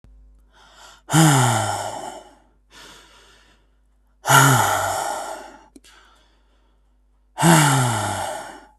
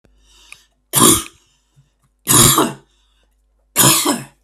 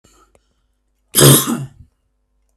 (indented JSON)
{
  "exhalation_length": "8.8 s",
  "exhalation_amplitude": 32766,
  "exhalation_signal_mean_std_ratio": 0.46,
  "three_cough_length": "4.4 s",
  "three_cough_amplitude": 32768,
  "three_cough_signal_mean_std_ratio": 0.41,
  "cough_length": "2.6 s",
  "cough_amplitude": 32768,
  "cough_signal_mean_std_ratio": 0.31,
  "survey_phase": "beta (2021-08-13 to 2022-03-07)",
  "age": "18-44",
  "gender": "Male",
  "wearing_mask": "No",
  "symptom_headache": true,
  "smoker_status": "Never smoked",
  "respiratory_condition_asthma": true,
  "respiratory_condition_other": false,
  "recruitment_source": "REACT",
  "submission_delay": "2 days",
  "covid_test_result": "Negative",
  "covid_test_method": "RT-qPCR",
  "influenza_a_test_result": "Negative",
  "influenza_b_test_result": "Negative"
}